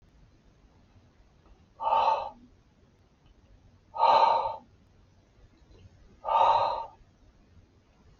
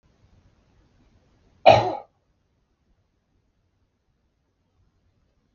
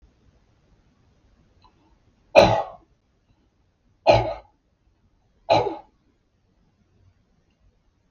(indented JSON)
{
  "exhalation_length": "8.2 s",
  "exhalation_amplitude": 10325,
  "exhalation_signal_mean_std_ratio": 0.38,
  "cough_length": "5.5 s",
  "cough_amplitude": 32766,
  "cough_signal_mean_std_ratio": 0.16,
  "three_cough_length": "8.1 s",
  "three_cough_amplitude": 32768,
  "three_cough_signal_mean_std_ratio": 0.23,
  "survey_phase": "beta (2021-08-13 to 2022-03-07)",
  "age": "65+",
  "gender": "Male",
  "wearing_mask": "No",
  "symptom_none": true,
  "smoker_status": "Ex-smoker",
  "respiratory_condition_asthma": false,
  "respiratory_condition_other": false,
  "recruitment_source": "REACT",
  "submission_delay": "1 day",
  "covid_test_result": "Negative",
  "covid_test_method": "RT-qPCR",
  "influenza_a_test_result": "Unknown/Void",
  "influenza_b_test_result": "Unknown/Void"
}